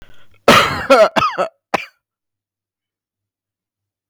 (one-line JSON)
{"cough_length": "4.1 s", "cough_amplitude": 32768, "cough_signal_mean_std_ratio": 0.36, "survey_phase": "beta (2021-08-13 to 2022-03-07)", "age": "18-44", "gender": "Male", "wearing_mask": "No", "symptom_none": true, "smoker_status": "Ex-smoker", "respiratory_condition_asthma": false, "respiratory_condition_other": false, "recruitment_source": "REACT", "submission_delay": "2 days", "covid_test_result": "Negative", "covid_test_method": "RT-qPCR", "influenza_a_test_result": "Negative", "influenza_b_test_result": "Negative"}